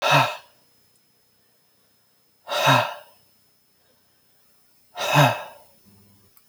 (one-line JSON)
{"exhalation_length": "6.5 s", "exhalation_amplitude": 23122, "exhalation_signal_mean_std_ratio": 0.33, "survey_phase": "alpha (2021-03-01 to 2021-08-12)", "age": "18-44", "gender": "Male", "wearing_mask": "No", "symptom_none": true, "smoker_status": "Never smoked", "respiratory_condition_asthma": false, "respiratory_condition_other": false, "recruitment_source": "REACT", "submission_delay": "2 days", "covid_test_result": "Negative", "covid_test_method": "RT-qPCR"}